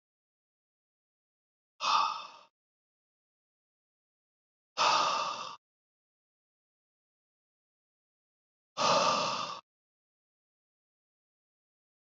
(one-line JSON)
{"exhalation_length": "12.1 s", "exhalation_amplitude": 6486, "exhalation_signal_mean_std_ratio": 0.3, "survey_phase": "beta (2021-08-13 to 2022-03-07)", "age": "45-64", "gender": "Male", "wearing_mask": "No", "symptom_cough_any": true, "symptom_runny_or_blocked_nose": true, "symptom_headache": true, "smoker_status": "Ex-smoker", "respiratory_condition_asthma": false, "respiratory_condition_other": false, "recruitment_source": "Test and Trace", "submission_delay": "2 days", "covid_test_result": "Positive", "covid_test_method": "RT-qPCR", "covid_ct_value": 19.7, "covid_ct_gene": "ORF1ab gene", "covid_ct_mean": 20.8, "covid_viral_load": "150000 copies/ml", "covid_viral_load_category": "Low viral load (10K-1M copies/ml)"}